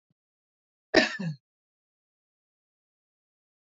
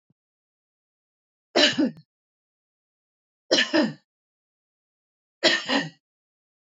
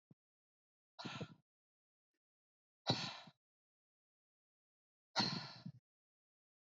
{"cough_length": "3.8 s", "cough_amplitude": 19505, "cough_signal_mean_std_ratio": 0.19, "three_cough_length": "6.7 s", "three_cough_amplitude": 18291, "three_cough_signal_mean_std_ratio": 0.3, "exhalation_length": "6.7 s", "exhalation_amplitude": 2813, "exhalation_signal_mean_std_ratio": 0.26, "survey_phase": "beta (2021-08-13 to 2022-03-07)", "age": "45-64", "gender": "Female", "wearing_mask": "No", "symptom_none": true, "smoker_status": "Never smoked", "respiratory_condition_asthma": false, "respiratory_condition_other": false, "recruitment_source": "REACT", "submission_delay": "1 day", "covid_test_result": "Negative", "covid_test_method": "RT-qPCR"}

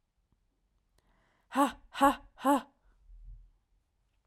{"exhalation_length": "4.3 s", "exhalation_amplitude": 8793, "exhalation_signal_mean_std_ratio": 0.28, "survey_phase": "beta (2021-08-13 to 2022-03-07)", "age": "18-44", "gender": "Female", "wearing_mask": "No", "symptom_cough_any": true, "symptom_headache": true, "symptom_onset": "12 days", "smoker_status": "Current smoker (11 or more cigarettes per day)", "respiratory_condition_asthma": false, "respiratory_condition_other": false, "recruitment_source": "REACT", "submission_delay": "3 days", "covid_test_result": "Negative", "covid_test_method": "RT-qPCR", "influenza_a_test_result": "Negative", "influenza_b_test_result": "Negative"}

